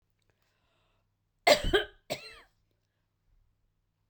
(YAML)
cough_length: 4.1 s
cough_amplitude: 14055
cough_signal_mean_std_ratio: 0.22
survey_phase: beta (2021-08-13 to 2022-03-07)
age: 45-64
gender: Female
wearing_mask: 'No'
symptom_none: true
smoker_status: Never smoked
respiratory_condition_asthma: false
respiratory_condition_other: false
recruitment_source: REACT
submission_delay: 2 days
covid_test_result: Negative
covid_test_method: RT-qPCR